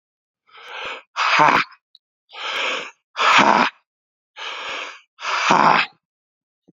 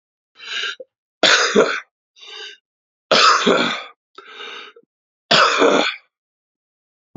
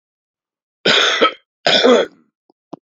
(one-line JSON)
{"exhalation_length": "6.7 s", "exhalation_amplitude": 31739, "exhalation_signal_mean_std_ratio": 0.46, "three_cough_length": "7.2 s", "three_cough_amplitude": 32768, "three_cough_signal_mean_std_ratio": 0.44, "cough_length": "2.8 s", "cough_amplitude": 32092, "cough_signal_mean_std_ratio": 0.46, "survey_phase": "beta (2021-08-13 to 2022-03-07)", "age": "18-44", "gender": "Male", "wearing_mask": "No", "symptom_cough_any": true, "symptom_runny_or_blocked_nose": true, "symptom_sore_throat": true, "symptom_change_to_sense_of_smell_or_taste": true, "symptom_loss_of_taste": true, "smoker_status": "Current smoker (e-cigarettes or vapes only)", "respiratory_condition_asthma": false, "respiratory_condition_other": false, "recruitment_source": "Test and Trace", "submission_delay": "3 days", "covid_test_result": "Positive", "covid_test_method": "RT-qPCR"}